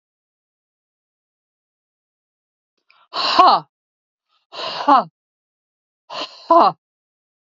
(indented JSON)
{
  "exhalation_length": "7.6 s",
  "exhalation_amplitude": 27952,
  "exhalation_signal_mean_std_ratio": 0.28,
  "survey_phase": "beta (2021-08-13 to 2022-03-07)",
  "age": "45-64",
  "gender": "Female",
  "wearing_mask": "No",
  "symptom_none": true,
  "smoker_status": "Ex-smoker",
  "respiratory_condition_asthma": false,
  "respiratory_condition_other": false,
  "recruitment_source": "Test and Trace",
  "submission_delay": "1 day",
  "covid_test_result": "Positive",
  "covid_test_method": "LFT"
}